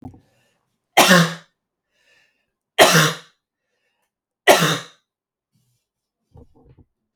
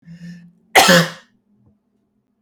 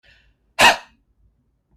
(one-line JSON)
{"three_cough_length": "7.2 s", "three_cough_amplitude": 32767, "three_cough_signal_mean_std_ratio": 0.29, "cough_length": "2.4 s", "cough_amplitude": 32768, "cough_signal_mean_std_ratio": 0.32, "exhalation_length": "1.8 s", "exhalation_amplitude": 32768, "exhalation_signal_mean_std_ratio": 0.24, "survey_phase": "beta (2021-08-13 to 2022-03-07)", "age": "18-44", "gender": "Male", "wearing_mask": "No", "symptom_none": true, "smoker_status": "Never smoked", "respiratory_condition_asthma": true, "respiratory_condition_other": false, "recruitment_source": "REACT", "submission_delay": "2 days", "covid_test_result": "Negative", "covid_test_method": "RT-qPCR", "influenza_a_test_result": "Negative", "influenza_b_test_result": "Negative"}